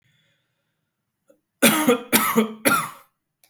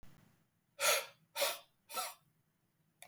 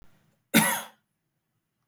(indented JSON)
{
  "three_cough_length": "3.5 s",
  "three_cough_amplitude": 29272,
  "three_cough_signal_mean_std_ratio": 0.41,
  "exhalation_length": "3.1 s",
  "exhalation_amplitude": 4451,
  "exhalation_signal_mean_std_ratio": 0.36,
  "cough_length": "1.9 s",
  "cough_amplitude": 18291,
  "cough_signal_mean_std_ratio": 0.28,
  "survey_phase": "beta (2021-08-13 to 2022-03-07)",
  "age": "18-44",
  "gender": "Male",
  "wearing_mask": "No",
  "symptom_none": true,
  "smoker_status": "Never smoked",
  "respiratory_condition_asthma": false,
  "respiratory_condition_other": false,
  "recruitment_source": "REACT",
  "submission_delay": "2 days",
  "covid_test_result": "Negative",
  "covid_test_method": "RT-qPCR",
  "influenza_a_test_result": "Negative",
  "influenza_b_test_result": "Negative"
}